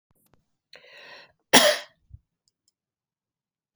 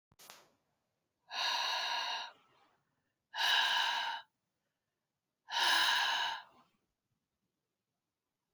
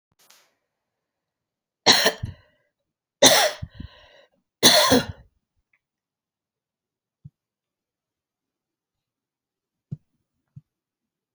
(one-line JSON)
{"cough_length": "3.8 s", "cough_amplitude": 32503, "cough_signal_mean_std_ratio": 0.2, "exhalation_length": "8.5 s", "exhalation_amplitude": 4106, "exhalation_signal_mean_std_ratio": 0.47, "three_cough_length": "11.3 s", "three_cough_amplitude": 32768, "three_cough_signal_mean_std_ratio": 0.23, "survey_phase": "alpha (2021-03-01 to 2021-08-12)", "age": "65+", "gender": "Female", "wearing_mask": "No", "symptom_cough_any": true, "symptom_fatigue": true, "symptom_headache": true, "symptom_change_to_sense_of_smell_or_taste": true, "symptom_loss_of_taste": true, "symptom_onset": "5 days", "smoker_status": "Never smoked", "respiratory_condition_asthma": false, "respiratory_condition_other": false, "recruitment_source": "Test and Trace", "submission_delay": "1 day", "covid_test_result": "Positive", "covid_test_method": "RT-qPCR", "covid_ct_value": 15.1, "covid_ct_gene": "ORF1ab gene", "covid_ct_mean": 16.0, "covid_viral_load": "5500000 copies/ml", "covid_viral_load_category": "High viral load (>1M copies/ml)"}